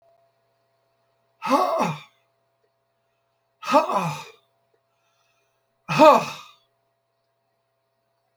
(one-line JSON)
{"exhalation_length": "8.4 s", "exhalation_amplitude": 28816, "exhalation_signal_mean_std_ratio": 0.28, "survey_phase": "beta (2021-08-13 to 2022-03-07)", "age": "65+", "gender": "Male", "wearing_mask": "No", "symptom_none": true, "smoker_status": "Never smoked", "respiratory_condition_asthma": false, "respiratory_condition_other": false, "recruitment_source": "REACT", "submission_delay": "5 days", "covid_test_result": "Negative", "covid_test_method": "RT-qPCR"}